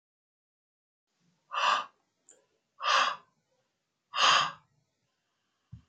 {
  "exhalation_length": "5.9 s",
  "exhalation_amplitude": 10899,
  "exhalation_signal_mean_std_ratio": 0.32,
  "survey_phase": "beta (2021-08-13 to 2022-03-07)",
  "age": "45-64",
  "gender": "Male",
  "wearing_mask": "No",
  "symptom_cough_any": true,
  "symptom_runny_or_blocked_nose": true,
  "symptom_headache": true,
  "symptom_onset": "4 days",
  "smoker_status": "Never smoked",
  "respiratory_condition_asthma": false,
  "respiratory_condition_other": false,
  "recruitment_source": "Test and Trace",
  "submission_delay": "1 day",
  "covid_test_result": "Positive",
  "covid_test_method": "LAMP"
}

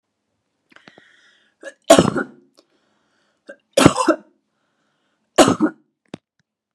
{
  "three_cough_length": "6.7 s",
  "three_cough_amplitude": 32768,
  "three_cough_signal_mean_std_ratio": 0.26,
  "survey_phase": "beta (2021-08-13 to 2022-03-07)",
  "age": "45-64",
  "gender": "Female",
  "wearing_mask": "No",
  "symptom_none": true,
  "symptom_onset": "12 days",
  "smoker_status": "Ex-smoker",
  "respiratory_condition_asthma": false,
  "respiratory_condition_other": false,
  "recruitment_source": "REACT",
  "submission_delay": "2 days",
  "covid_test_result": "Negative",
  "covid_test_method": "RT-qPCR"
}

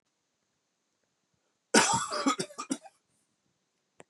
{
  "cough_length": "4.1 s",
  "cough_amplitude": 16613,
  "cough_signal_mean_std_ratio": 0.3,
  "survey_phase": "beta (2021-08-13 to 2022-03-07)",
  "age": "45-64",
  "gender": "Male",
  "wearing_mask": "No",
  "symptom_cough_any": true,
  "symptom_fatigue": true,
  "symptom_headache": true,
  "symptom_onset": "6 days",
  "smoker_status": "Ex-smoker",
  "respiratory_condition_asthma": false,
  "respiratory_condition_other": false,
  "recruitment_source": "Test and Trace",
  "submission_delay": "2 days",
  "covid_test_result": "Positive",
  "covid_test_method": "RT-qPCR"
}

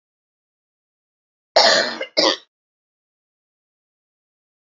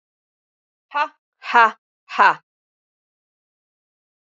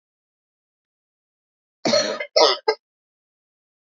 {
  "three_cough_length": "4.7 s",
  "three_cough_amplitude": 29236,
  "three_cough_signal_mean_std_ratio": 0.27,
  "exhalation_length": "4.3 s",
  "exhalation_amplitude": 28634,
  "exhalation_signal_mean_std_ratio": 0.24,
  "cough_length": "3.8 s",
  "cough_amplitude": 28221,
  "cough_signal_mean_std_ratio": 0.29,
  "survey_phase": "alpha (2021-03-01 to 2021-08-12)",
  "age": "45-64",
  "gender": "Female",
  "wearing_mask": "No",
  "symptom_none": true,
  "symptom_onset": "2 days",
  "smoker_status": "Never smoked",
  "respiratory_condition_asthma": false,
  "respiratory_condition_other": false,
  "recruitment_source": "REACT",
  "submission_delay": "1 day",
  "covid_test_result": "Negative",
  "covid_test_method": "RT-qPCR"
}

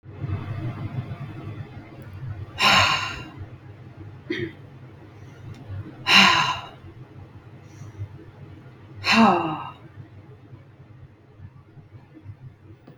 {
  "exhalation_length": "13.0 s",
  "exhalation_amplitude": 30991,
  "exhalation_signal_mean_std_ratio": 0.43,
  "survey_phase": "beta (2021-08-13 to 2022-03-07)",
  "age": "18-44",
  "gender": "Female",
  "wearing_mask": "No",
  "symptom_runny_or_blocked_nose": true,
  "smoker_status": "Never smoked",
  "respiratory_condition_asthma": false,
  "respiratory_condition_other": false,
  "recruitment_source": "REACT",
  "submission_delay": "2 days",
  "covid_test_result": "Negative",
  "covid_test_method": "RT-qPCR",
  "influenza_a_test_result": "Negative",
  "influenza_b_test_result": "Negative"
}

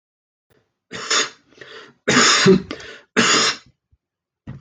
{
  "three_cough_length": "4.6 s",
  "three_cough_amplitude": 26140,
  "three_cough_signal_mean_std_ratio": 0.43,
  "survey_phase": "alpha (2021-03-01 to 2021-08-12)",
  "age": "45-64",
  "gender": "Male",
  "wearing_mask": "No",
  "symptom_none": true,
  "smoker_status": "Never smoked",
  "respiratory_condition_asthma": false,
  "respiratory_condition_other": false,
  "recruitment_source": "REACT",
  "submission_delay": "1 day",
  "covid_test_result": "Negative",
  "covid_test_method": "RT-qPCR"
}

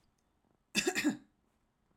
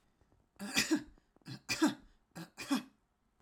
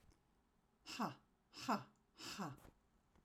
{
  "cough_length": "2.0 s",
  "cough_amplitude": 4965,
  "cough_signal_mean_std_ratio": 0.34,
  "three_cough_length": "3.4 s",
  "three_cough_amplitude": 5281,
  "three_cough_signal_mean_std_ratio": 0.38,
  "exhalation_length": "3.2 s",
  "exhalation_amplitude": 1343,
  "exhalation_signal_mean_std_ratio": 0.39,
  "survey_phase": "alpha (2021-03-01 to 2021-08-12)",
  "age": "45-64",
  "gender": "Female",
  "wearing_mask": "No",
  "symptom_none": true,
  "smoker_status": "Never smoked",
  "respiratory_condition_asthma": false,
  "respiratory_condition_other": false,
  "recruitment_source": "REACT",
  "submission_delay": "3 days",
  "covid_test_result": "Negative",
  "covid_test_method": "RT-qPCR"
}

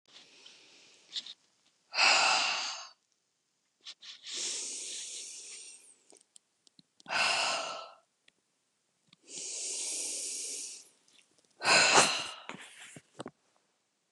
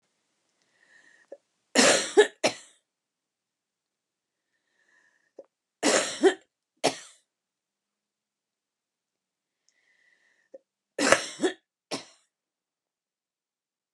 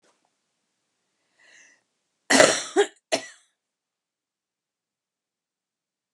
{
  "exhalation_length": "14.1 s",
  "exhalation_amplitude": 15045,
  "exhalation_signal_mean_std_ratio": 0.41,
  "three_cough_length": "13.9 s",
  "three_cough_amplitude": 32767,
  "three_cough_signal_mean_std_ratio": 0.23,
  "cough_length": "6.1 s",
  "cough_amplitude": 32767,
  "cough_signal_mean_std_ratio": 0.21,
  "survey_phase": "beta (2021-08-13 to 2022-03-07)",
  "age": "45-64",
  "gender": "Female",
  "wearing_mask": "No",
  "symptom_cough_any": true,
  "symptom_runny_or_blocked_nose": true,
  "symptom_sore_throat": true,
  "symptom_diarrhoea": true,
  "symptom_fatigue": true,
  "smoker_status": "Ex-smoker",
  "respiratory_condition_asthma": false,
  "respiratory_condition_other": false,
  "recruitment_source": "Test and Trace",
  "submission_delay": "0 days",
  "covid_test_result": "Negative",
  "covid_test_method": "LFT"
}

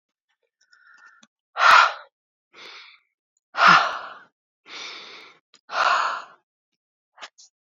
{
  "exhalation_length": "7.8 s",
  "exhalation_amplitude": 27125,
  "exhalation_signal_mean_std_ratio": 0.31,
  "survey_phase": "beta (2021-08-13 to 2022-03-07)",
  "age": "45-64",
  "gender": "Female",
  "wearing_mask": "No",
  "symptom_new_continuous_cough": true,
  "symptom_runny_or_blocked_nose": true,
  "symptom_fatigue": true,
  "symptom_headache": true,
  "symptom_change_to_sense_of_smell_or_taste": true,
  "symptom_loss_of_taste": true,
  "symptom_onset": "3 days",
  "smoker_status": "Never smoked",
  "respiratory_condition_asthma": false,
  "respiratory_condition_other": false,
  "recruitment_source": "Test and Trace",
  "submission_delay": "2 days",
  "covid_test_result": "Positive",
  "covid_test_method": "RT-qPCR"
}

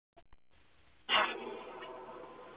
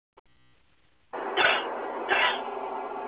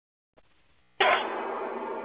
{
  "exhalation_length": "2.6 s",
  "exhalation_amplitude": 5000,
  "exhalation_signal_mean_std_ratio": 0.43,
  "three_cough_length": "3.1 s",
  "three_cough_amplitude": 11138,
  "three_cough_signal_mean_std_ratio": 0.62,
  "cough_length": "2.0 s",
  "cough_amplitude": 10568,
  "cough_signal_mean_std_ratio": 0.52,
  "survey_phase": "beta (2021-08-13 to 2022-03-07)",
  "age": "45-64",
  "gender": "Female",
  "wearing_mask": "No",
  "symptom_fatigue": true,
  "symptom_change_to_sense_of_smell_or_taste": true,
  "symptom_onset": "12 days",
  "smoker_status": "Ex-smoker",
  "respiratory_condition_asthma": true,
  "respiratory_condition_other": false,
  "recruitment_source": "REACT",
  "submission_delay": "3 days",
  "covid_test_result": "Negative",
  "covid_test_method": "RT-qPCR"
}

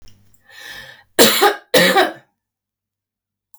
{
  "cough_length": "3.6 s",
  "cough_amplitude": 32768,
  "cough_signal_mean_std_ratio": 0.38,
  "survey_phase": "beta (2021-08-13 to 2022-03-07)",
  "age": "45-64",
  "gender": "Female",
  "wearing_mask": "No",
  "symptom_none": true,
  "smoker_status": "Ex-smoker",
  "respiratory_condition_asthma": false,
  "respiratory_condition_other": false,
  "recruitment_source": "REACT",
  "submission_delay": "2 days",
  "covid_test_result": "Negative",
  "covid_test_method": "RT-qPCR",
  "influenza_a_test_result": "Negative",
  "influenza_b_test_result": "Negative"
}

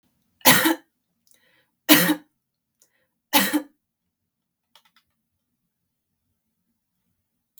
{
  "cough_length": "7.6 s",
  "cough_amplitude": 32768,
  "cough_signal_mean_std_ratio": 0.24,
  "survey_phase": "beta (2021-08-13 to 2022-03-07)",
  "age": "45-64",
  "gender": "Female",
  "wearing_mask": "No",
  "symptom_none": true,
  "smoker_status": "Never smoked",
  "respiratory_condition_asthma": false,
  "respiratory_condition_other": false,
  "recruitment_source": "REACT",
  "submission_delay": "1 day",
  "covid_test_result": "Negative",
  "covid_test_method": "RT-qPCR",
  "influenza_a_test_result": "Negative",
  "influenza_b_test_result": "Negative"
}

